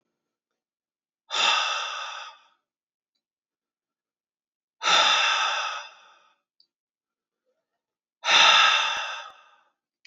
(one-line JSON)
{"exhalation_length": "10.1 s", "exhalation_amplitude": 19505, "exhalation_signal_mean_std_ratio": 0.39, "survey_phase": "beta (2021-08-13 to 2022-03-07)", "age": "45-64", "gender": "Male", "wearing_mask": "No", "symptom_fatigue": true, "smoker_status": "Never smoked", "respiratory_condition_asthma": false, "respiratory_condition_other": false, "recruitment_source": "REACT", "submission_delay": "2 days", "covid_test_result": "Negative", "covid_test_method": "RT-qPCR", "influenza_a_test_result": "Negative", "influenza_b_test_result": "Negative"}